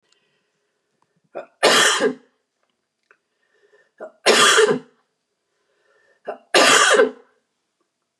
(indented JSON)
{
  "three_cough_length": "8.2 s",
  "three_cough_amplitude": 30081,
  "three_cough_signal_mean_std_ratio": 0.37,
  "survey_phase": "beta (2021-08-13 to 2022-03-07)",
  "age": "45-64",
  "gender": "Female",
  "wearing_mask": "No",
  "symptom_none": true,
  "smoker_status": "Never smoked",
  "respiratory_condition_asthma": false,
  "respiratory_condition_other": false,
  "recruitment_source": "REACT",
  "submission_delay": "1 day",
  "covid_test_result": "Negative",
  "covid_test_method": "RT-qPCR",
  "influenza_a_test_result": "Negative",
  "influenza_b_test_result": "Negative"
}